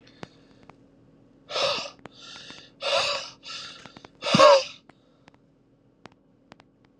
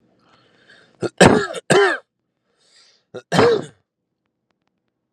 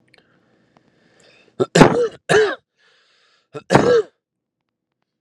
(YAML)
exhalation_length: 7.0 s
exhalation_amplitude: 21985
exhalation_signal_mean_std_ratio: 0.3
cough_length: 5.1 s
cough_amplitude: 32768
cough_signal_mean_std_ratio: 0.33
three_cough_length: 5.2 s
three_cough_amplitude: 32768
three_cough_signal_mean_std_ratio: 0.33
survey_phase: alpha (2021-03-01 to 2021-08-12)
age: 18-44
gender: Male
wearing_mask: 'Yes'
symptom_cough_any: true
symptom_new_continuous_cough: true
symptom_shortness_of_breath: true
symptom_abdominal_pain: true
symptom_diarrhoea: true
symptom_fatigue: true
symptom_fever_high_temperature: true
symptom_headache: true
symptom_change_to_sense_of_smell_or_taste: true
symptom_loss_of_taste: true
smoker_status: Current smoker (11 or more cigarettes per day)
respiratory_condition_asthma: false
respiratory_condition_other: false
recruitment_source: Test and Trace
submission_delay: 2 days
covid_test_result: Positive
covid_test_method: RT-qPCR
covid_ct_value: 19.4
covid_ct_gene: ORF1ab gene
covid_ct_mean: 19.8
covid_viral_load: 320000 copies/ml
covid_viral_load_category: Low viral load (10K-1M copies/ml)